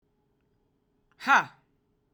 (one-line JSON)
{"exhalation_length": "2.1 s", "exhalation_amplitude": 13208, "exhalation_signal_mean_std_ratio": 0.22, "survey_phase": "beta (2021-08-13 to 2022-03-07)", "age": "18-44", "gender": "Female", "wearing_mask": "No", "symptom_cough_any": true, "symptom_runny_or_blocked_nose": true, "symptom_abdominal_pain": true, "symptom_headache": true, "symptom_loss_of_taste": true, "smoker_status": "Current smoker (1 to 10 cigarettes per day)", "respiratory_condition_asthma": false, "respiratory_condition_other": false, "recruitment_source": "Test and Trace", "submission_delay": "2 days", "covid_test_result": "Positive", "covid_test_method": "RT-qPCR", "covid_ct_value": 19.7, "covid_ct_gene": "ORF1ab gene", "covid_ct_mean": 20.4, "covid_viral_load": "200000 copies/ml", "covid_viral_load_category": "Low viral load (10K-1M copies/ml)"}